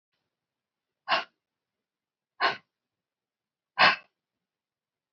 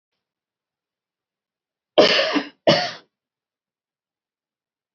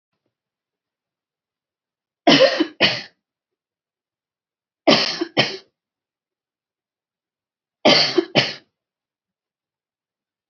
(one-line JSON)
{"exhalation_length": "5.1 s", "exhalation_amplitude": 15374, "exhalation_signal_mean_std_ratio": 0.21, "cough_length": "4.9 s", "cough_amplitude": 27619, "cough_signal_mean_std_ratio": 0.27, "three_cough_length": "10.5 s", "three_cough_amplitude": 32543, "three_cough_signal_mean_std_ratio": 0.28, "survey_phase": "beta (2021-08-13 to 2022-03-07)", "age": "18-44", "gender": "Female", "wearing_mask": "No", "symptom_none": true, "smoker_status": "Never smoked", "respiratory_condition_asthma": false, "respiratory_condition_other": false, "recruitment_source": "Test and Trace", "submission_delay": "-1 day", "covid_test_result": "Negative", "covid_test_method": "LFT"}